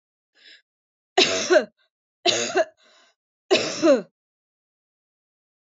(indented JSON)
{
  "three_cough_length": "5.6 s",
  "three_cough_amplitude": 21326,
  "three_cough_signal_mean_std_ratio": 0.36,
  "survey_phase": "beta (2021-08-13 to 2022-03-07)",
  "age": "45-64",
  "gender": "Female",
  "wearing_mask": "No",
  "symptom_none": true,
  "smoker_status": "Never smoked",
  "respiratory_condition_asthma": true,
  "respiratory_condition_other": false,
  "recruitment_source": "REACT",
  "submission_delay": "3 days",
  "covid_test_result": "Negative",
  "covid_test_method": "RT-qPCR",
  "influenza_a_test_result": "Negative",
  "influenza_b_test_result": "Negative"
}